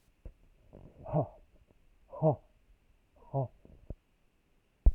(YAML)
exhalation_length: 4.9 s
exhalation_amplitude: 9709
exhalation_signal_mean_std_ratio: 0.26
survey_phase: beta (2021-08-13 to 2022-03-07)
age: 65+
gender: Male
wearing_mask: 'No'
symptom_none: true
smoker_status: Ex-smoker
respiratory_condition_asthma: false
respiratory_condition_other: false
recruitment_source: REACT
submission_delay: 2 days
covid_test_result: Negative
covid_test_method: RT-qPCR